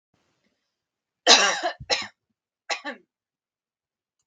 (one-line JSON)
{"cough_length": "4.3 s", "cough_amplitude": 32768, "cough_signal_mean_std_ratio": 0.27, "survey_phase": "beta (2021-08-13 to 2022-03-07)", "age": "18-44", "gender": "Female", "wearing_mask": "No", "symptom_none": true, "smoker_status": "Never smoked", "respiratory_condition_asthma": false, "respiratory_condition_other": false, "recruitment_source": "REACT", "submission_delay": "1 day", "covid_test_result": "Negative", "covid_test_method": "RT-qPCR", "influenza_a_test_result": "Negative", "influenza_b_test_result": "Negative"}